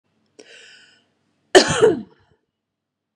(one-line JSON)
{"cough_length": "3.2 s", "cough_amplitude": 32768, "cough_signal_mean_std_ratio": 0.26, "survey_phase": "beta (2021-08-13 to 2022-03-07)", "age": "45-64", "gender": "Female", "wearing_mask": "No", "symptom_runny_or_blocked_nose": true, "symptom_sore_throat": true, "symptom_headache": true, "smoker_status": "Never smoked", "respiratory_condition_asthma": false, "respiratory_condition_other": false, "recruitment_source": "REACT", "submission_delay": "2 days", "covid_test_result": "Negative", "covid_test_method": "RT-qPCR", "influenza_a_test_result": "Negative", "influenza_b_test_result": "Negative"}